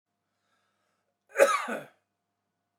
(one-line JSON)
{"cough_length": "2.8 s", "cough_amplitude": 14341, "cough_signal_mean_std_ratio": 0.25, "survey_phase": "alpha (2021-03-01 to 2021-08-12)", "age": "65+", "gender": "Male", "wearing_mask": "No", "symptom_none": true, "smoker_status": "Never smoked", "respiratory_condition_asthma": false, "respiratory_condition_other": false, "recruitment_source": "REACT", "submission_delay": "2 days", "covid_test_result": "Negative", "covid_test_method": "RT-qPCR"}